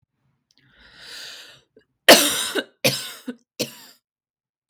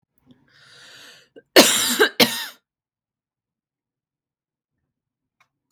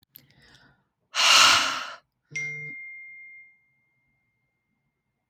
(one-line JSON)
{"three_cough_length": "4.7 s", "three_cough_amplitude": 32768, "three_cough_signal_mean_std_ratio": 0.27, "cough_length": "5.7 s", "cough_amplitude": 32767, "cough_signal_mean_std_ratio": 0.25, "exhalation_length": "5.3 s", "exhalation_amplitude": 25672, "exhalation_signal_mean_std_ratio": 0.33, "survey_phase": "beta (2021-08-13 to 2022-03-07)", "age": "18-44", "gender": "Female", "wearing_mask": "No", "symptom_none": true, "smoker_status": "Never smoked", "respiratory_condition_asthma": false, "respiratory_condition_other": false, "recruitment_source": "REACT", "submission_delay": "1 day", "covid_test_result": "Negative", "covid_test_method": "RT-qPCR", "influenza_a_test_result": "Negative", "influenza_b_test_result": "Negative"}